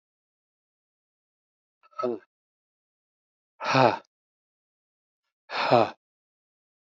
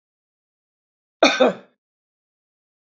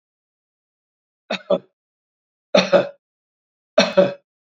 {"exhalation_length": "6.8 s", "exhalation_amplitude": 21424, "exhalation_signal_mean_std_ratio": 0.24, "cough_length": "2.9 s", "cough_amplitude": 27475, "cough_signal_mean_std_ratio": 0.24, "three_cough_length": "4.5 s", "three_cough_amplitude": 27683, "three_cough_signal_mean_std_ratio": 0.29, "survey_phase": "beta (2021-08-13 to 2022-03-07)", "age": "65+", "gender": "Male", "wearing_mask": "No", "symptom_none": true, "smoker_status": "Never smoked", "respiratory_condition_asthma": false, "respiratory_condition_other": false, "recruitment_source": "REACT", "submission_delay": "1 day", "covid_test_result": "Negative", "covid_test_method": "RT-qPCR", "influenza_a_test_result": "Unknown/Void", "influenza_b_test_result": "Unknown/Void"}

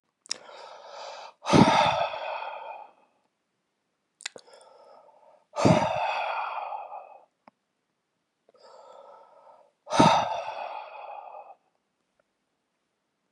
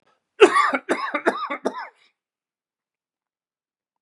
{"exhalation_length": "13.3 s", "exhalation_amplitude": 22522, "exhalation_signal_mean_std_ratio": 0.36, "cough_length": "4.0 s", "cough_amplitude": 32645, "cough_signal_mean_std_ratio": 0.31, "survey_phase": "beta (2021-08-13 to 2022-03-07)", "age": "45-64", "gender": "Male", "wearing_mask": "No", "symptom_none": true, "smoker_status": "Never smoked", "respiratory_condition_asthma": false, "respiratory_condition_other": false, "recruitment_source": "REACT", "submission_delay": "2 days", "covid_test_result": "Negative", "covid_test_method": "RT-qPCR", "covid_ct_value": 43.0, "covid_ct_gene": "N gene"}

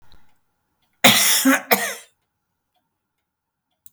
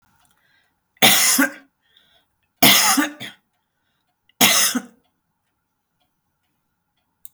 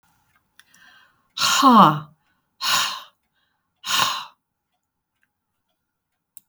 {"cough_length": "3.9 s", "cough_amplitude": 32768, "cough_signal_mean_std_ratio": 0.34, "three_cough_length": "7.3 s", "three_cough_amplitude": 32768, "three_cough_signal_mean_std_ratio": 0.34, "exhalation_length": "6.5 s", "exhalation_amplitude": 31541, "exhalation_signal_mean_std_ratio": 0.32, "survey_phase": "beta (2021-08-13 to 2022-03-07)", "age": "65+", "gender": "Female", "wearing_mask": "No", "symptom_none": true, "smoker_status": "Never smoked", "respiratory_condition_asthma": false, "respiratory_condition_other": false, "recruitment_source": "REACT", "submission_delay": "1 day", "covid_test_result": "Negative", "covid_test_method": "RT-qPCR", "influenza_a_test_result": "Negative", "influenza_b_test_result": "Negative"}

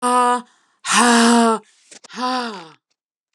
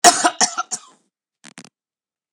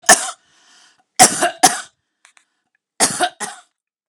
{"exhalation_length": "3.3 s", "exhalation_amplitude": 32680, "exhalation_signal_mean_std_ratio": 0.54, "cough_length": "2.3 s", "cough_amplitude": 32768, "cough_signal_mean_std_ratio": 0.29, "three_cough_length": "4.1 s", "three_cough_amplitude": 32768, "three_cough_signal_mean_std_ratio": 0.32, "survey_phase": "beta (2021-08-13 to 2022-03-07)", "age": "45-64", "gender": "Female", "wearing_mask": "No", "symptom_none": true, "smoker_status": "Ex-smoker", "respiratory_condition_asthma": false, "respiratory_condition_other": false, "recruitment_source": "REACT", "submission_delay": "1 day", "covid_test_result": "Negative", "covid_test_method": "RT-qPCR", "influenza_a_test_result": "Negative", "influenza_b_test_result": "Negative"}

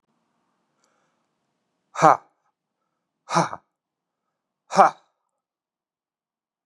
{"exhalation_length": "6.7 s", "exhalation_amplitude": 32287, "exhalation_signal_mean_std_ratio": 0.18, "survey_phase": "beta (2021-08-13 to 2022-03-07)", "age": "45-64", "gender": "Male", "wearing_mask": "No", "symptom_cough_any": true, "symptom_new_continuous_cough": true, "symptom_runny_or_blocked_nose": true, "symptom_shortness_of_breath": true, "symptom_sore_throat": true, "symptom_diarrhoea": true, "symptom_fatigue": true, "symptom_fever_high_temperature": true, "symptom_headache": true, "symptom_change_to_sense_of_smell_or_taste": true, "symptom_loss_of_taste": true, "smoker_status": "Current smoker (1 to 10 cigarettes per day)", "respiratory_condition_asthma": false, "respiratory_condition_other": false, "recruitment_source": "Test and Trace", "submission_delay": "2 days", "covid_test_result": "Positive", "covid_test_method": "RT-qPCR", "covid_ct_value": 19.8, "covid_ct_gene": "ORF1ab gene", "covid_ct_mean": 20.5, "covid_viral_load": "190000 copies/ml", "covid_viral_load_category": "Low viral load (10K-1M copies/ml)"}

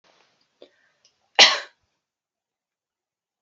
{"cough_length": "3.4 s", "cough_amplitude": 32766, "cough_signal_mean_std_ratio": 0.17, "survey_phase": "beta (2021-08-13 to 2022-03-07)", "age": "18-44", "gender": "Female", "wearing_mask": "No", "symptom_sore_throat": true, "symptom_onset": "4 days", "smoker_status": "Never smoked", "respiratory_condition_asthma": false, "respiratory_condition_other": false, "recruitment_source": "REACT", "submission_delay": "1 day", "covid_test_result": "Negative", "covid_test_method": "RT-qPCR"}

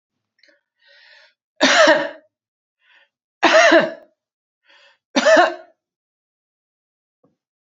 {"three_cough_length": "7.8 s", "three_cough_amplitude": 32768, "three_cough_signal_mean_std_ratio": 0.33, "survey_phase": "beta (2021-08-13 to 2022-03-07)", "age": "65+", "gender": "Female", "wearing_mask": "No", "symptom_none": true, "smoker_status": "Never smoked", "respiratory_condition_asthma": false, "respiratory_condition_other": false, "recruitment_source": "REACT", "submission_delay": "1 day", "covid_test_result": "Negative", "covid_test_method": "RT-qPCR"}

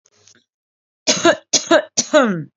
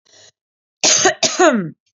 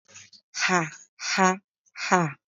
{"three_cough_length": "2.6 s", "three_cough_amplitude": 32767, "three_cough_signal_mean_std_ratio": 0.45, "cough_length": "2.0 s", "cough_amplitude": 29621, "cough_signal_mean_std_ratio": 0.5, "exhalation_length": "2.5 s", "exhalation_amplitude": 24337, "exhalation_signal_mean_std_ratio": 0.43, "survey_phase": "beta (2021-08-13 to 2022-03-07)", "age": "18-44", "gender": "Female", "wearing_mask": "No", "symptom_none": true, "smoker_status": "Never smoked", "respiratory_condition_asthma": false, "respiratory_condition_other": false, "recruitment_source": "REACT", "submission_delay": "2 days", "covid_test_result": "Negative", "covid_test_method": "RT-qPCR"}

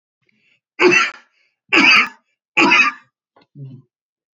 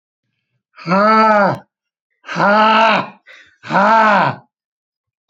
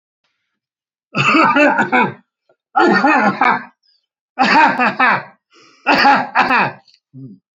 {"three_cough_length": "4.4 s", "three_cough_amplitude": 29874, "three_cough_signal_mean_std_ratio": 0.41, "exhalation_length": "5.3 s", "exhalation_amplitude": 31660, "exhalation_signal_mean_std_ratio": 0.54, "cough_length": "7.6 s", "cough_amplitude": 31220, "cough_signal_mean_std_ratio": 0.57, "survey_phase": "beta (2021-08-13 to 2022-03-07)", "age": "65+", "gender": "Male", "wearing_mask": "No", "symptom_none": true, "smoker_status": "Never smoked", "respiratory_condition_asthma": false, "respiratory_condition_other": false, "recruitment_source": "REACT", "submission_delay": "1 day", "covid_test_result": "Negative", "covid_test_method": "RT-qPCR", "influenza_a_test_result": "Negative", "influenza_b_test_result": "Negative"}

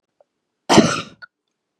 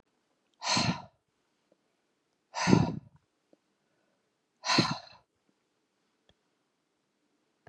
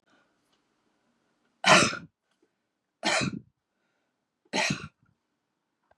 {"cough_length": "1.8 s", "cough_amplitude": 32768, "cough_signal_mean_std_ratio": 0.3, "exhalation_length": "7.7 s", "exhalation_amplitude": 16310, "exhalation_signal_mean_std_ratio": 0.27, "three_cough_length": "6.0 s", "three_cough_amplitude": 21910, "three_cough_signal_mean_std_ratio": 0.27, "survey_phase": "beta (2021-08-13 to 2022-03-07)", "age": "65+", "gender": "Female", "wearing_mask": "No", "symptom_none": true, "smoker_status": "Never smoked", "respiratory_condition_asthma": false, "respiratory_condition_other": false, "recruitment_source": "REACT", "submission_delay": "1 day", "covid_test_result": "Negative", "covid_test_method": "RT-qPCR", "influenza_a_test_result": "Negative", "influenza_b_test_result": "Negative"}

